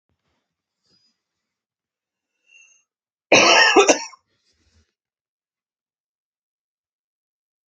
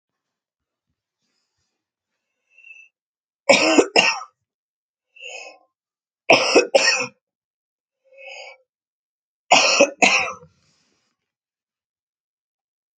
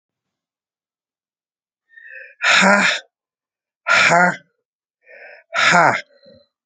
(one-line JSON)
{"cough_length": "7.7 s", "cough_amplitude": 29273, "cough_signal_mean_std_ratio": 0.23, "three_cough_length": "13.0 s", "three_cough_amplitude": 32767, "three_cough_signal_mean_std_ratio": 0.29, "exhalation_length": "6.7 s", "exhalation_amplitude": 32047, "exhalation_signal_mean_std_ratio": 0.39, "survey_phase": "alpha (2021-03-01 to 2021-08-12)", "age": "45-64", "gender": "Female", "wearing_mask": "No", "symptom_new_continuous_cough": true, "symptom_fatigue": true, "symptom_change_to_sense_of_smell_or_taste": true, "symptom_onset": "4 days", "smoker_status": "Ex-smoker", "respiratory_condition_asthma": false, "respiratory_condition_other": false, "recruitment_source": "Test and Trace", "submission_delay": "1 day", "covid_test_result": "Positive", "covid_test_method": "RT-qPCR", "covid_ct_value": 30.0, "covid_ct_gene": "ORF1ab gene"}